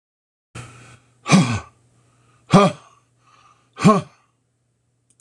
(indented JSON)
{
  "exhalation_length": "5.2 s",
  "exhalation_amplitude": 26028,
  "exhalation_signal_mean_std_ratio": 0.29,
  "survey_phase": "alpha (2021-03-01 to 2021-08-12)",
  "age": "45-64",
  "gender": "Male",
  "wearing_mask": "No",
  "symptom_none": true,
  "smoker_status": "Never smoked",
  "recruitment_source": "REACT",
  "submission_delay": "2 days",
  "covid_test_result": "Negative",
  "covid_test_method": "RT-qPCR"
}